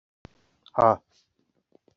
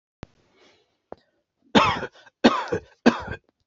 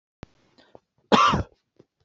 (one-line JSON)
{"exhalation_length": "2.0 s", "exhalation_amplitude": 19136, "exhalation_signal_mean_std_ratio": 0.2, "three_cough_length": "3.7 s", "three_cough_amplitude": 27417, "three_cough_signal_mean_std_ratio": 0.31, "cough_length": "2.0 s", "cough_amplitude": 25323, "cough_signal_mean_std_ratio": 0.31, "survey_phase": "beta (2021-08-13 to 2022-03-07)", "age": "18-44", "gender": "Male", "wearing_mask": "No", "symptom_none": true, "smoker_status": "Never smoked", "respiratory_condition_asthma": false, "respiratory_condition_other": false, "recruitment_source": "REACT", "submission_delay": "2 days", "covid_test_result": "Negative", "covid_test_method": "RT-qPCR", "influenza_a_test_result": "Unknown/Void", "influenza_b_test_result": "Unknown/Void"}